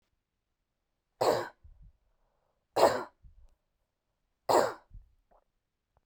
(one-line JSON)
{"three_cough_length": "6.1 s", "three_cough_amplitude": 11806, "three_cough_signal_mean_std_ratio": 0.26, "survey_phase": "beta (2021-08-13 to 2022-03-07)", "age": "18-44", "gender": "Female", "wearing_mask": "No", "symptom_abdominal_pain": true, "smoker_status": "Never smoked", "respiratory_condition_asthma": false, "respiratory_condition_other": false, "recruitment_source": "REACT", "submission_delay": "3 days", "covid_test_result": "Negative", "covid_test_method": "RT-qPCR"}